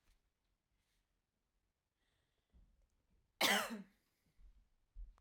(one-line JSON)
{"cough_length": "5.2 s", "cough_amplitude": 3041, "cough_signal_mean_std_ratio": 0.23, "survey_phase": "alpha (2021-03-01 to 2021-08-12)", "age": "45-64", "gender": "Female", "wearing_mask": "No", "symptom_none": true, "smoker_status": "Never smoked", "respiratory_condition_asthma": true, "respiratory_condition_other": false, "recruitment_source": "REACT", "submission_delay": "2 days", "covid_test_result": "Negative", "covid_test_method": "RT-qPCR"}